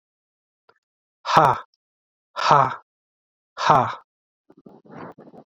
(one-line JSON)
{"exhalation_length": "5.5 s", "exhalation_amplitude": 32767, "exhalation_signal_mean_std_ratio": 0.31, "survey_phase": "beta (2021-08-13 to 2022-03-07)", "age": "45-64", "gender": "Male", "wearing_mask": "No", "symptom_cough_any": true, "symptom_runny_or_blocked_nose": true, "symptom_sore_throat": true, "symptom_abdominal_pain": true, "symptom_fatigue": true, "symptom_fever_high_temperature": true, "symptom_headache": true, "symptom_other": true, "smoker_status": "Never smoked", "respiratory_condition_asthma": false, "respiratory_condition_other": false, "recruitment_source": "Test and Trace", "submission_delay": "1 day", "covid_test_result": "Positive", "covid_test_method": "LFT"}